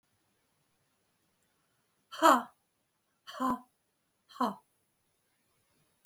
exhalation_length: 6.1 s
exhalation_amplitude: 13820
exhalation_signal_mean_std_ratio: 0.21
survey_phase: beta (2021-08-13 to 2022-03-07)
age: 45-64
gender: Female
wearing_mask: 'No'
symptom_none: true
smoker_status: Ex-smoker
respiratory_condition_asthma: true
respiratory_condition_other: false
recruitment_source: REACT
submission_delay: 5 days
covid_test_result: Negative
covid_test_method: RT-qPCR
influenza_a_test_result: Negative
influenza_b_test_result: Negative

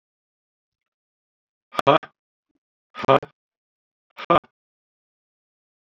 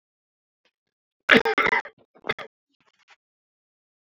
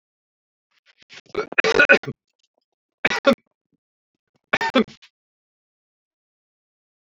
exhalation_length: 5.9 s
exhalation_amplitude: 26484
exhalation_signal_mean_std_ratio: 0.19
cough_length: 4.1 s
cough_amplitude: 32767
cough_signal_mean_std_ratio: 0.24
three_cough_length: 7.2 s
three_cough_amplitude: 28788
three_cough_signal_mean_std_ratio: 0.24
survey_phase: alpha (2021-03-01 to 2021-08-12)
age: 65+
gender: Male
wearing_mask: 'No'
symptom_none: true
smoker_status: Never smoked
respiratory_condition_asthma: false
respiratory_condition_other: false
recruitment_source: REACT
submission_delay: 1 day
covid_test_result: Negative
covid_test_method: RT-qPCR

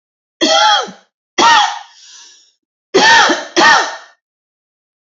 three_cough_length: 5.0 s
three_cough_amplitude: 30532
three_cough_signal_mean_std_ratio: 0.51
survey_phase: alpha (2021-03-01 to 2021-08-12)
age: 45-64
gender: Female
wearing_mask: 'No'
symptom_cough_any: true
symptom_fatigue: true
symptom_change_to_sense_of_smell_or_taste: true
symptom_loss_of_taste: true
smoker_status: Never smoked
respiratory_condition_asthma: false
respiratory_condition_other: false
recruitment_source: Test and Trace
submission_delay: 2 days
covid_test_result: Positive
covid_test_method: RT-qPCR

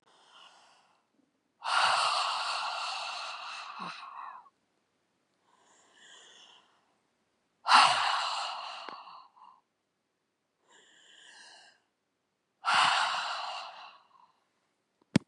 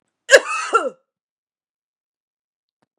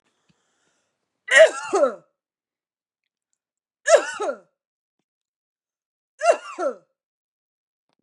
exhalation_length: 15.3 s
exhalation_amplitude: 13360
exhalation_signal_mean_std_ratio: 0.38
cough_length: 3.0 s
cough_amplitude: 32768
cough_signal_mean_std_ratio: 0.24
three_cough_length: 8.0 s
three_cough_amplitude: 29739
three_cough_signal_mean_std_ratio: 0.26
survey_phase: beta (2021-08-13 to 2022-03-07)
age: 45-64
gender: Female
wearing_mask: 'No'
symptom_none: true
smoker_status: Never smoked
respiratory_condition_asthma: false
respiratory_condition_other: false
recruitment_source: REACT
submission_delay: 2 days
covid_test_result: Negative
covid_test_method: RT-qPCR
influenza_a_test_result: Negative
influenza_b_test_result: Negative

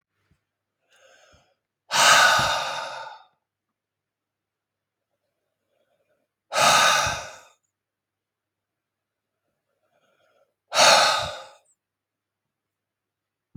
exhalation_length: 13.6 s
exhalation_amplitude: 27514
exhalation_signal_mean_std_ratio: 0.31
survey_phase: beta (2021-08-13 to 2022-03-07)
age: 45-64
gender: Male
wearing_mask: 'No'
symptom_none: true
smoker_status: Ex-smoker
respiratory_condition_asthma: false
respiratory_condition_other: false
recruitment_source: REACT
submission_delay: 0 days
covid_test_result: Negative
covid_test_method: RT-qPCR
influenza_a_test_result: Negative
influenza_b_test_result: Negative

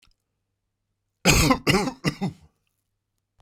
cough_length: 3.4 s
cough_amplitude: 22350
cough_signal_mean_std_ratio: 0.36
survey_phase: beta (2021-08-13 to 2022-03-07)
age: 65+
gender: Male
wearing_mask: 'No'
symptom_none: true
smoker_status: Ex-smoker
respiratory_condition_asthma: false
respiratory_condition_other: false
recruitment_source: REACT
submission_delay: 2 days
covid_test_result: Negative
covid_test_method: RT-qPCR
influenza_a_test_result: Unknown/Void
influenza_b_test_result: Unknown/Void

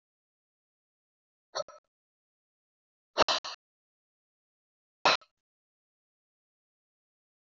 exhalation_length: 7.6 s
exhalation_amplitude: 10293
exhalation_signal_mean_std_ratio: 0.16
survey_phase: alpha (2021-03-01 to 2021-08-12)
age: 45-64
gender: Male
wearing_mask: 'No'
symptom_cough_any: true
symptom_change_to_sense_of_smell_or_taste: true
symptom_loss_of_taste: true
smoker_status: Never smoked
respiratory_condition_asthma: false
respiratory_condition_other: false
recruitment_source: Test and Trace
submission_delay: 2 days
covid_test_result: Positive
covid_test_method: RT-qPCR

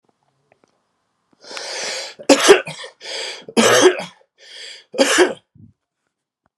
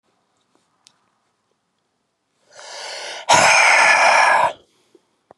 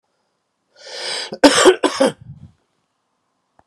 three_cough_length: 6.6 s
three_cough_amplitude: 32768
three_cough_signal_mean_std_ratio: 0.37
exhalation_length: 5.4 s
exhalation_amplitude: 32075
exhalation_signal_mean_std_ratio: 0.43
cough_length: 3.7 s
cough_amplitude: 32768
cough_signal_mean_std_ratio: 0.33
survey_phase: beta (2021-08-13 to 2022-03-07)
age: 45-64
gender: Male
wearing_mask: 'No'
symptom_cough_any: true
symptom_shortness_of_breath: true
symptom_abdominal_pain: true
symptom_other: true
symptom_onset: 3 days
smoker_status: Never smoked
respiratory_condition_asthma: false
respiratory_condition_other: false
recruitment_source: Test and Trace
submission_delay: 2 days
covid_test_result: Positive
covid_test_method: RT-qPCR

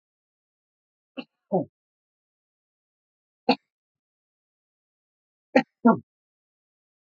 three_cough_length: 7.2 s
three_cough_amplitude: 19682
three_cough_signal_mean_std_ratio: 0.16
survey_phase: beta (2021-08-13 to 2022-03-07)
age: 45-64
gender: Male
wearing_mask: 'No'
symptom_cough_any: true
symptom_abdominal_pain: true
symptom_diarrhoea: true
symptom_fatigue: true
symptom_fever_high_temperature: true
symptom_headache: true
symptom_change_to_sense_of_smell_or_taste: true
symptom_loss_of_taste: true
symptom_onset: 4 days
smoker_status: Never smoked
respiratory_condition_asthma: true
respiratory_condition_other: false
recruitment_source: Test and Trace
submission_delay: 2 days
covid_test_result: Positive
covid_test_method: RT-qPCR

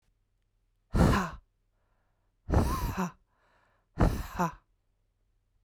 exhalation_length: 5.6 s
exhalation_amplitude: 10588
exhalation_signal_mean_std_ratio: 0.38
survey_phase: beta (2021-08-13 to 2022-03-07)
age: 45-64
gender: Female
wearing_mask: 'No'
symptom_none: true
smoker_status: Never smoked
respiratory_condition_asthma: false
respiratory_condition_other: false
recruitment_source: REACT
submission_delay: 2 days
covid_test_result: Negative
covid_test_method: RT-qPCR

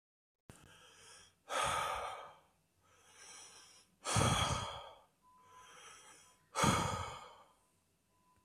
exhalation_length: 8.4 s
exhalation_amplitude: 3894
exhalation_signal_mean_std_ratio: 0.42
survey_phase: beta (2021-08-13 to 2022-03-07)
age: 18-44
gender: Male
wearing_mask: 'No'
symptom_cough_any: true
symptom_runny_or_blocked_nose: true
symptom_fatigue: true
symptom_headache: true
symptom_other: true
symptom_onset: 4 days
smoker_status: Never smoked
respiratory_condition_asthma: false
respiratory_condition_other: false
recruitment_source: Test and Trace
submission_delay: 2 days
covid_test_result: Positive
covid_test_method: RT-qPCR
covid_ct_value: 16.4
covid_ct_gene: ORF1ab gene
covid_ct_mean: 17.0
covid_viral_load: 2700000 copies/ml
covid_viral_load_category: High viral load (>1M copies/ml)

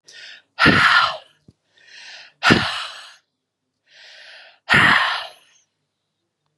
exhalation_length: 6.6 s
exhalation_amplitude: 32768
exhalation_signal_mean_std_ratio: 0.39
survey_phase: beta (2021-08-13 to 2022-03-07)
age: 65+
gender: Female
wearing_mask: 'No'
symptom_none: true
smoker_status: Ex-smoker
respiratory_condition_asthma: false
respiratory_condition_other: false
recruitment_source: REACT
submission_delay: 2 days
covid_test_result: Negative
covid_test_method: RT-qPCR
influenza_a_test_result: Negative
influenza_b_test_result: Negative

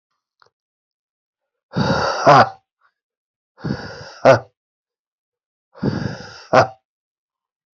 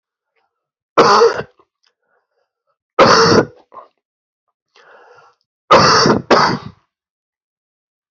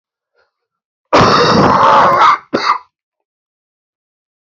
exhalation_length: 7.8 s
exhalation_amplitude: 28254
exhalation_signal_mean_std_ratio: 0.3
three_cough_length: 8.1 s
three_cough_amplitude: 32767
three_cough_signal_mean_std_ratio: 0.38
cough_length: 4.5 s
cough_amplitude: 30059
cough_signal_mean_std_ratio: 0.51
survey_phase: beta (2021-08-13 to 2022-03-07)
age: 18-44
gender: Male
wearing_mask: 'No'
symptom_cough_any: true
symptom_abdominal_pain: true
symptom_fatigue: true
symptom_fever_high_temperature: true
symptom_headache: true
symptom_onset: 4 days
smoker_status: Never smoked
respiratory_condition_asthma: false
respiratory_condition_other: false
recruitment_source: Test and Trace
submission_delay: 1 day
covid_test_result: Positive
covid_test_method: RT-qPCR
covid_ct_value: 12.8
covid_ct_gene: ORF1ab gene
covid_ct_mean: 13.2
covid_viral_load: 48000000 copies/ml
covid_viral_load_category: High viral load (>1M copies/ml)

